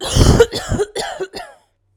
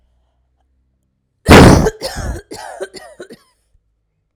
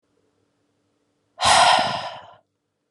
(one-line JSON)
{"cough_length": "2.0 s", "cough_amplitude": 32768, "cough_signal_mean_std_ratio": 0.52, "three_cough_length": "4.4 s", "three_cough_amplitude": 32768, "three_cough_signal_mean_std_ratio": 0.31, "exhalation_length": "2.9 s", "exhalation_amplitude": 24162, "exhalation_signal_mean_std_ratio": 0.38, "survey_phase": "alpha (2021-03-01 to 2021-08-12)", "age": "18-44", "gender": "Female", "wearing_mask": "No", "symptom_cough_any": true, "symptom_new_continuous_cough": true, "symptom_fatigue": true, "symptom_fever_high_temperature": true, "symptom_headache": true, "symptom_onset": "6 days", "smoker_status": "Never smoked", "respiratory_condition_asthma": false, "respiratory_condition_other": false, "recruitment_source": "Test and Trace", "submission_delay": "2 days", "covid_test_result": "Positive", "covid_test_method": "RT-qPCR", "covid_ct_value": 25.3, "covid_ct_gene": "S gene", "covid_ct_mean": 25.5, "covid_viral_load": "4200 copies/ml", "covid_viral_load_category": "Minimal viral load (< 10K copies/ml)"}